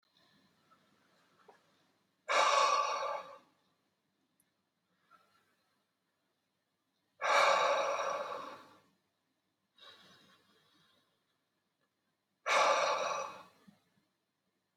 {"exhalation_length": "14.8 s", "exhalation_amplitude": 5821, "exhalation_signal_mean_std_ratio": 0.36, "survey_phase": "beta (2021-08-13 to 2022-03-07)", "age": "45-64", "gender": "Male", "wearing_mask": "No", "symptom_none": true, "smoker_status": "Never smoked", "respiratory_condition_asthma": false, "respiratory_condition_other": false, "recruitment_source": "REACT", "submission_delay": "2 days", "covid_test_result": "Negative", "covid_test_method": "RT-qPCR", "influenza_a_test_result": "Negative", "influenza_b_test_result": "Negative"}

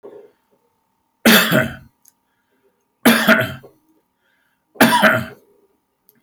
{"three_cough_length": "6.2 s", "three_cough_amplitude": 32481, "three_cough_signal_mean_std_ratio": 0.37, "survey_phase": "alpha (2021-03-01 to 2021-08-12)", "age": "65+", "gender": "Male", "wearing_mask": "No", "symptom_none": true, "smoker_status": "Ex-smoker", "respiratory_condition_asthma": false, "respiratory_condition_other": false, "recruitment_source": "REACT", "submission_delay": "1 day", "covid_test_result": "Negative", "covid_test_method": "RT-qPCR"}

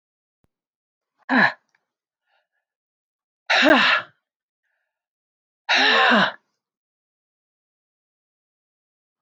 {"exhalation_length": "9.2 s", "exhalation_amplitude": 26085, "exhalation_signal_mean_std_ratio": 0.31, "survey_phase": "alpha (2021-03-01 to 2021-08-12)", "age": "65+", "gender": "Female", "wearing_mask": "No", "symptom_none": true, "smoker_status": "Never smoked", "respiratory_condition_asthma": false, "respiratory_condition_other": false, "recruitment_source": "REACT", "submission_delay": "3 days", "covid_test_result": "Negative", "covid_test_method": "RT-qPCR"}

